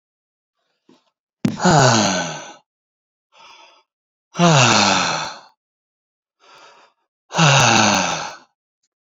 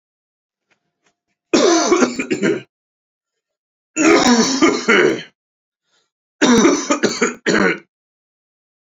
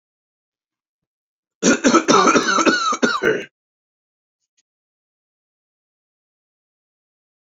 {"exhalation_length": "9.0 s", "exhalation_amplitude": 32768, "exhalation_signal_mean_std_ratio": 0.44, "three_cough_length": "8.9 s", "three_cough_amplitude": 29026, "three_cough_signal_mean_std_ratio": 0.5, "cough_length": "7.5 s", "cough_amplitude": 29960, "cough_signal_mean_std_ratio": 0.36, "survey_phase": "beta (2021-08-13 to 2022-03-07)", "age": "18-44", "gender": "Male", "wearing_mask": "No", "symptom_none": true, "smoker_status": "Never smoked", "respiratory_condition_asthma": false, "respiratory_condition_other": false, "recruitment_source": "REACT", "submission_delay": "3 days", "covid_test_result": "Negative", "covid_test_method": "RT-qPCR", "influenza_a_test_result": "Unknown/Void", "influenza_b_test_result": "Unknown/Void"}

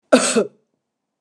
{"cough_length": "1.2 s", "cough_amplitude": 32767, "cough_signal_mean_std_ratio": 0.38, "survey_phase": "beta (2021-08-13 to 2022-03-07)", "age": "65+", "gender": "Female", "wearing_mask": "No", "symptom_runny_or_blocked_nose": true, "symptom_sore_throat": true, "symptom_onset": "2 days", "smoker_status": "Never smoked", "respiratory_condition_asthma": false, "respiratory_condition_other": false, "recruitment_source": "Test and Trace", "submission_delay": "1 day", "covid_test_result": "Positive", "covid_test_method": "RT-qPCR", "covid_ct_value": 24.1, "covid_ct_gene": "N gene"}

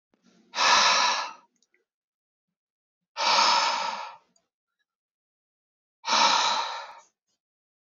{"exhalation_length": "7.9 s", "exhalation_amplitude": 14090, "exhalation_signal_mean_std_ratio": 0.44, "survey_phase": "beta (2021-08-13 to 2022-03-07)", "age": "18-44", "gender": "Male", "wearing_mask": "No", "symptom_cough_any": true, "symptom_runny_or_blocked_nose": true, "symptom_sore_throat": true, "symptom_fatigue": true, "symptom_fever_high_temperature": true, "symptom_headache": true, "smoker_status": "Ex-smoker", "respiratory_condition_asthma": false, "respiratory_condition_other": false, "recruitment_source": "Test and Trace", "submission_delay": "1 day", "covid_test_result": "Positive", "covid_test_method": "LFT"}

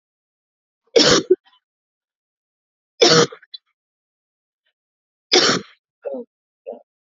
{"three_cough_length": "7.1 s", "three_cough_amplitude": 32767, "three_cough_signal_mean_std_ratio": 0.29, "survey_phase": "beta (2021-08-13 to 2022-03-07)", "age": "45-64", "gender": "Female", "wearing_mask": "No", "symptom_cough_any": true, "symptom_runny_or_blocked_nose": true, "symptom_onset": "4 days", "smoker_status": "Ex-smoker", "respiratory_condition_asthma": false, "respiratory_condition_other": false, "recruitment_source": "Test and Trace", "submission_delay": "2 days", "covid_test_result": "Positive", "covid_test_method": "RT-qPCR", "covid_ct_value": 35.0, "covid_ct_gene": "ORF1ab gene"}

